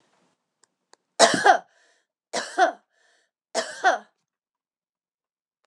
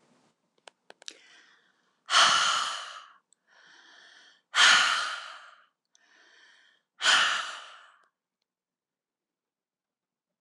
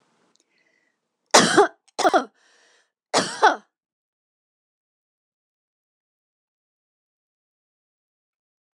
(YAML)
three_cough_length: 5.7 s
three_cough_amplitude: 25886
three_cough_signal_mean_std_ratio: 0.28
exhalation_length: 10.4 s
exhalation_amplitude: 17612
exhalation_signal_mean_std_ratio: 0.33
cough_length: 8.7 s
cough_amplitude: 26028
cough_signal_mean_std_ratio: 0.22
survey_phase: beta (2021-08-13 to 2022-03-07)
age: 65+
gender: Female
wearing_mask: 'No'
symptom_none: true
smoker_status: Never smoked
respiratory_condition_asthma: false
respiratory_condition_other: false
recruitment_source: REACT
submission_delay: 5 days
covid_test_result: Negative
covid_test_method: RT-qPCR